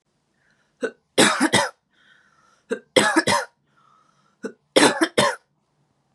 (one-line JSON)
{"three_cough_length": "6.1 s", "three_cough_amplitude": 31530, "three_cough_signal_mean_std_ratio": 0.37, "survey_phase": "beta (2021-08-13 to 2022-03-07)", "age": "18-44", "gender": "Female", "wearing_mask": "No", "symptom_other": true, "smoker_status": "Never smoked", "respiratory_condition_asthma": false, "respiratory_condition_other": false, "recruitment_source": "Test and Trace", "submission_delay": "1 day", "covid_test_result": "Positive", "covid_test_method": "RT-qPCR", "covid_ct_value": 32.2, "covid_ct_gene": "N gene", "covid_ct_mean": 32.3, "covid_viral_load": "26 copies/ml", "covid_viral_load_category": "Minimal viral load (< 10K copies/ml)"}